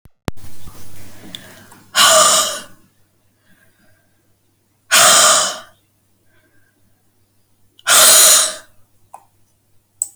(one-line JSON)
{"exhalation_length": "10.2 s", "exhalation_amplitude": 32768, "exhalation_signal_mean_std_ratio": 0.41, "survey_phase": "alpha (2021-03-01 to 2021-08-12)", "age": "65+", "gender": "Female", "wearing_mask": "No", "symptom_none": true, "smoker_status": "Never smoked", "respiratory_condition_asthma": false, "respiratory_condition_other": false, "recruitment_source": "REACT", "submission_delay": "2 days", "covid_test_result": "Negative", "covid_test_method": "RT-qPCR"}